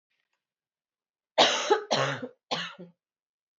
{"three_cough_length": "3.6 s", "three_cough_amplitude": 18220, "three_cough_signal_mean_std_ratio": 0.37, "survey_phase": "beta (2021-08-13 to 2022-03-07)", "age": "18-44", "gender": "Female", "wearing_mask": "No", "symptom_cough_any": true, "symptom_runny_or_blocked_nose": true, "symptom_shortness_of_breath": true, "symptom_fatigue": true, "symptom_headache": true, "symptom_other": true, "smoker_status": "Never smoked", "respiratory_condition_asthma": false, "respiratory_condition_other": false, "recruitment_source": "Test and Trace", "submission_delay": "3 days", "covid_test_result": "Positive", "covid_test_method": "RT-qPCR", "covid_ct_value": 22.7, "covid_ct_gene": "N gene", "covid_ct_mean": 22.9, "covid_viral_load": "32000 copies/ml", "covid_viral_load_category": "Low viral load (10K-1M copies/ml)"}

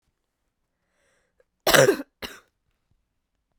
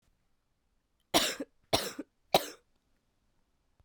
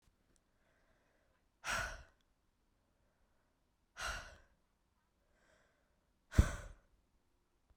{"cough_length": "3.6 s", "cough_amplitude": 32768, "cough_signal_mean_std_ratio": 0.23, "three_cough_length": "3.8 s", "three_cough_amplitude": 12306, "three_cough_signal_mean_std_ratio": 0.26, "exhalation_length": "7.8 s", "exhalation_amplitude": 6512, "exhalation_signal_mean_std_ratio": 0.19, "survey_phase": "beta (2021-08-13 to 2022-03-07)", "age": "18-44", "gender": "Female", "wearing_mask": "No", "symptom_cough_any": true, "symptom_new_continuous_cough": true, "symptom_runny_or_blocked_nose": true, "symptom_shortness_of_breath": true, "symptom_sore_throat": true, "symptom_fatigue": true, "symptom_headache": true, "symptom_other": true, "symptom_onset": "3 days", "smoker_status": "Never smoked", "respiratory_condition_asthma": true, "respiratory_condition_other": false, "recruitment_source": "Test and Trace", "submission_delay": "1 day", "covid_test_result": "Positive", "covid_test_method": "ePCR"}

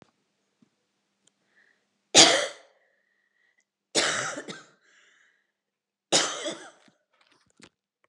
{"three_cough_length": "8.1 s", "three_cough_amplitude": 30405, "three_cough_signal_mean_std_ratio": 0.24, "survey_phase": "beta (2021-08-13 to 2022-03-07)", "age": "18-44", "gender": "Female", "wearing_mask": "No", "symptom_cough_any": true, "symptom_runny_or_blocked_nose": true, "symptom_shortness_of_breath": true, "symptom_sore_throat": true, "symptom_abdominal_pain": true, "symptom_fatigue": true, "symptom_fever_high_temperature": true, "symptom_headache": true, "symptom_change_to_sense_of_smell_or_taste": true, "symptom_other": true, "symptom_onset": "4 days", "smoker_status": "Ex-smoker", "respiratory_condition_asthma": false, "respiratory_condition_other": false, "recruitment_source": "Test and Trace", "submission_delay": "1 day", "covid_test_result": "Positive", "covid_test_method": "RT-qPCR", "covid_ct_value": 17.5, "covid_ct_gene": "N gene"}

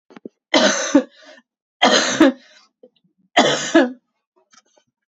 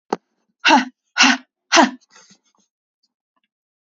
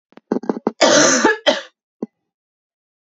{"three_cough_length": "5.1 s", "three_cough_amplitude": 28795, "three_cough_signal_mean_std_ratio": 0.41, "exhalation_length": "3.9 s", "exhalation_amplitude": 31816, "exhalation_signal_mean_std_ratio": 0.3, "cough_length": "3.2 s", "cough_amplitude": 31956, "cough_signal_mean_std_ratio": 0.42, "survey_phase": "beta (2021-08-13 to 2022-03-07)", "age": "18-44", "gender": "Female", "wearing_mask": "No", "symptom_cough_any": true, "symptom_runny_or_blocked_nose": true, "symptom_sore_throat": true, "smoker_status": "Ex-smoker", "respiratory_condition_asthma": false, "respiratory_condition_other": false, "recruitment_source": "Test and Trace", "submission_delay": "1 day", "covid_test_result": "Positive", "covid_test_method": "RT-qPCR"}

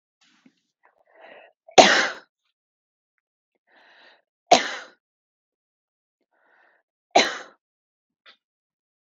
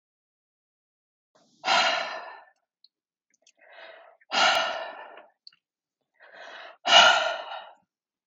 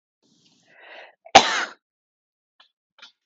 {"three_cough_length": "9.1 s", "three_cough_amplitude": 32767, "three_cough_signal_mean_std_ratio": 0.19, "exhalation_length": "8.3 s", "exhalation_amplitude": 24089, "exhalation_signal_mean_std_ratio": 0.33, "cough_length": "3.3 s", "cough_amplitude": 32768, "cough_signal_mean_std_ratio": 0.19, "survey_phase": "beta (2021-08-13 to 2022-03-07)", "age": "18-44", "gender": "Female", "wearing_mask": "No", "symptom_none": true, "smoker_status": "Current smoker (1 to 10 cigarettes per day)", "respiratory_condition_asthma": true, "respiratory_condition_other": false, "recruitment_source": "REACT", "submission_delay": "0 days", "covid_test_result": "Negative", "covid_test_method": "RT-qPCR", "influenza_a_test_result": "Negative", "influenza_b_test_result": "Negative"}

